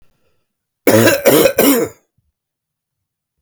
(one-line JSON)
{"three_cough_length": "3.4 s", "three_cough_amplitude": 32768, "three_cough_signal_mean_std_ratio": 0.43, "survey_phase": "beta (2021-08-13 to 2022-03-07)", "age": "45-64", "gender": "Male", "wearing_mask": "No", "symptom_new_continuous_cough": true, "symptom_sore_throat": true, "symptom_fatigue": true, "symptom_loss_of_taste": true, "symptom_onset": "4 days", "smoker_status": "Never smoked", "respiratory_condition_asthma": false, "respiratory_condition_other": false, "recruitment_source": "Test and Trace", "submission_delay": "1 day", "covid_test_result": "Positive", "covid_test_method": "RT-qPCR"}